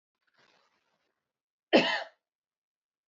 {"cough_length": "3.1 s", "cough_amplitude": 11283, "cough_signal_mean_std_ratio": 0.21, "survey_phase": "beta (2021-08-13 to 2022-03-07)", "age": "18-44", "gender": "Female", "wearing_mask": "No", "symptom_fatigue": true, "symptom_headache": true, "smoker_status": "Never smoked", "respiratory_condition_asthma": false, "respiratory_condition_other": false, "recruitment_source": "REACT", "submission_delay": "3 days", "covid_test_result": "Negative", "covid_test_method": "RT-qPCR", "influenza_a_test_result": "Negative", "influenza_b_test_result": "Negative"}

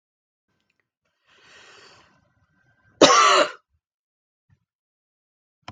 {"cough_length": "5.7 s", "cough_amplitude": 32766, "cough_signal_mean_std_ratio": 0.23, "survey_phase": "beta (2021-08-13 to 2022-03-07)", "age": "65+", "gender": "Female", "wearing_mask": "No", "symptom_sore_throat": true, "symptom_onset": "13 days", "smoker_status": "Ex-smoker", "respiratory_condition_asthma": false, "respiratory_condition_other": false, "recruitment_source": "REACT", "submission_delay": "3 days", "covid_test_result": "Negative", "covid_test_method": "RT-qPCR"}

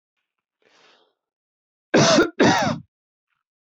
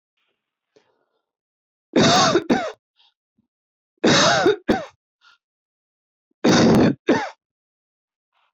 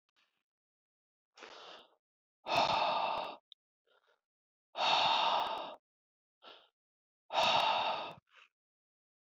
{"cough_length": "3.7 s", "cough_amplitude": 19771, "cough_signal_mean_std_ratio": 0.36, "three_cough_length": "8.5 s", "three_cough_amplitude": 20006, "three_cough_signal_mean_std_ratio": 0.41, "exhalation_length": "9.3 s", "exhalation_amplitude": 5534, "exhalation_signal_mean_std_ratio": 0.44, "survey_phase": "beta (2021-08-13 to 2022-03-07)", "age": "45-64", "gender": "Male", "wearing_mask": "No", "symptom_fatigue": true, "symptom_onset": "12 days", "smoker_status": "Never smoked", "respiratory_condition_asthma": false, "respiratory_condition_other": false, "recruitment_source": "REACT", "submission_delay": "3 days", "covid_test_result": "Negative", "covid_test_method": "RT-qPCR", "influenza_a_test_result": "Unknown/Void", "influenza_b_test_result": "Unknown/Void"}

